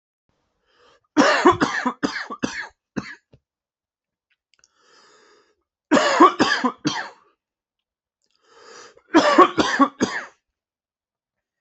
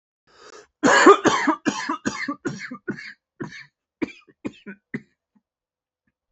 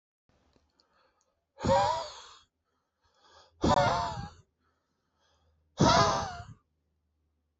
{
  "three_cough_length": "11.6 s",
  "three_cough_amplitude": 28514,
  "three_cough_signal_mean_std_ratio": 0.35,
  "cough_length": "6.3 s",
  "cough_amplitude": 28024,
  "cough_signal_mean_std_ratio": 0.33,
  "exhalation_length": "7.6 s",
  "exhalation_amplitude": 10235,
  "exhalation_signal_mean_std_ratio": 0.36,
  "survey_phase": "beta (2021-08-13 to 2022-03-07)",
  "age": "18-44",
  "gender": "Male",
  "wearing_mask": "No",
  "symptom_cough_any": true,
  "symptom_runny_or_blocked_nose": true,
  "symptom_sore_throat": true,
  "symptom_fatigue": true,
  "symptom_fever_high_temperature": true,
  "symptom_headache": true,
  "symptom_change_to_sense_of_smell_or_taste": true,
  "smoker_status": "Never smoked",
  "respiratory_condition_asthma": false,
  "respiratory_condition_other": false,
  "recruitment_source": "Test and Trace",
  "submission_delay": "2 days",
  "covid_test_result": "Positive",
  "covid_test_method": "RT-qPCR",
  "covid_ct_value": 12.5,
  "covid_ct_gene": "ORF1ab gene"
}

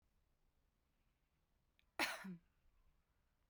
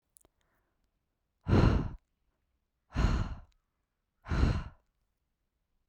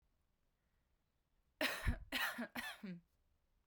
{
  "cough_length": "3.5 s",
  "cough_amplitude": 1871,
  "cough_signal_mean_std_ratio": 0.25,
  "exhalation_length": "5.9 s",
  "exhalation_amplitude": 9103,
  "exhalation_signal_mean_std_ratio": 0.34,
  "three_cough_length": "3.7 s",
  "three_cough_amplitude": 2164,
  "three_cough_signal_mean_std_ratio": 0.41,
  "survey_phase": "beta (2021-08-13 to 2022-03-07)",
  "age": "18-44",
  "gender": "Female",
  "wearing_mask": "No",
  "symptom_none": true,
  "smoker_status": "Never smoked",
  "respiratory_condition_asthma": false,
  "respiratory_condition_other": false,
  "recruitment_source": "Test and Trace",
  "submission_delay": "2 days",
  "covid_test_result": "Positive",
  "covid_test_method": "RT-qPCR",
  "covid_ct_value": 31.5,
  "covid_ct_gene": "N gene",
  "covid_ct_mean": 31.7,
  "covid_viral_load": "40 copies/ml",
  "covid_viral_load_category": "Minimal viral load (< 10K copies/ml)"
}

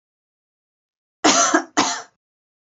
{
  "cough_length": "2.6 s",
  "cough_amplitude": 31058,
  "cough_signal_mean_std_ratio": 0.36,
  "survey_phase": "beta (2021-08-13 to 2022-03-07)",
  "age": "18-44",
  "gender": "Female",
  "wearing_mask": "No",
  "symptom_cough_any": true,
  "symptom_onset": "6 days",
  "smoker_status": "Never smoked",
  "respiratory_condition_asthma": false,
  "respiratory_condition_other": false,
  "recruitment_source": "REACT",
  "submission_delay": "1 day",
  "covid_test_result": "Negative",
  "covid_test_method": "RT-qPCR",
  "influenza_a_test_result": "Negative",
  "influenza_b_test_result": "Negative"
}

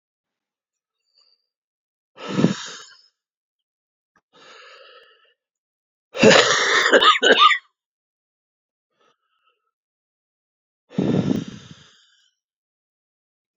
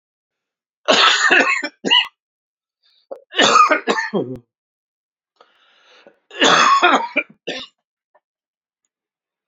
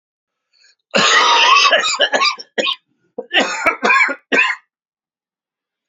{
  "exhalation_length": "13.6 s",
  "exhalation_amplitude": 32017,
  "exhalation_signal_mean_std_ratio": 0.29,
  "three_cough_length": "9.5 s",
  "three_cough_amplitude": 30133,
  "three_cough_signal_mean_std_ratio": 0.42,
  "cough_length": "5.9 s",
  "cough_amplitude": 32169,
  "cough_signal_mean_std_ratio": 0.55,
  "survey_phase": "beta (2021-08-13 to 2022-03-07)",
  "age": "45-64",
  "gender": "Male",
  "wearing_mask": "No",
  "symptom_cough_any": true,
  "symptom_new_continuous_cough": true,
  "symptom_shortness_of_breath": true,
  "symptom_fatigue": true,
  "symptom_fever_high_temperature": true,
  "symptom_headache": true,
  "symptom_change_to_sense_of_smell_or_taste": true,
  "symptom_onset": "4 days",
  "smoker_status": "Ex-smoker",
  "respiratory_condition_asthma": false,
  "respiratory_condition_other": false,
  "recruitment_source": "Test and Trace",
  "submission_delay": "2 days",
  "covid_test_result": "Positive",
  "covid_test_method": "RT-qPCR",
  "covid_ct_value": 22.1,
  "covid_ct_gene": "ORF1ab gene"
}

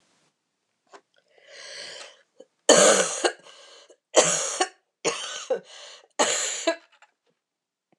{
  "three_cough_length": "8.0 s",
  "three_cough_amplitude": 26027,
  "three_cough_signal_mean_std_ratio": 0.36,
  "survey_phase": "beta (2021-08-13 to 2022-03-07)",
  "age": "45-64",
  "gender": "Female",
  "wearing_mask": "No",
  "symptom_cough_any": true,
  "symptom_runny_or_blocked_nose": true,
  "symptom_fatigue": true,
  "symptom_fever_high_temperature": true,
  "symptom_change_to_sense_of_smell_or_taste": true,
  "symptom_onset": "3 days",
  "smoker_status": "Never smoked",
  "respiratory_condition_asthma": false,
  "respiratory_condition_other": false,
  "recruitment_source": "Test and Trace",
  "submission_delay": "1 day",
  "covid_test_result": "Positive",
  "covid_test_method": "ePCR"
}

